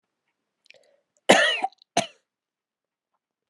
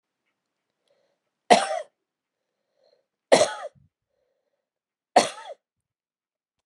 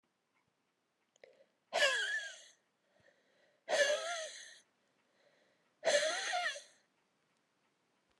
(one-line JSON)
{"cough_length": "3.5 s", "cough_amplitude": 29972, "cough_signal_mean_std_ratio": 0.25, "three_cough_length": "6.7 s", "three_cough_amplitude": 29809, "three_cough_signal_mean_std_ratio": 0.21, "exhalation_length": "8.2 s", "exhalation_amplitude": 4283, "exhalation_signal_mean_std_ratio": 0.39, "survey_phase": "alpha (2021-03-01 to 2021-08-12)", "age": "45-64", "gender": "Female", "wearing_mask": "No", "symptom_cough_any": true, "symptom_shortness_of_breath": true, "symptom_fatigue": true, "symptom_headache": true, "smoker_status": "Ex-smoker", "respiratory_condition_asthma": false, "respiratory_condition_other": false, "recruitment_source": "Test and Trace", "submission_delay": "2 days", "covid_test_result": "Positive", "covid_test_method": "RT-qPCR", "covid_ct_value": 20.4, "covid_ct_gene": "ORF1ab gene", "covid_ct_mean": 20.8, "covid_viral_load": "150000 copies/ml", "covid_viral_load_category": "Low viral load (10K-1M copies/ml)"}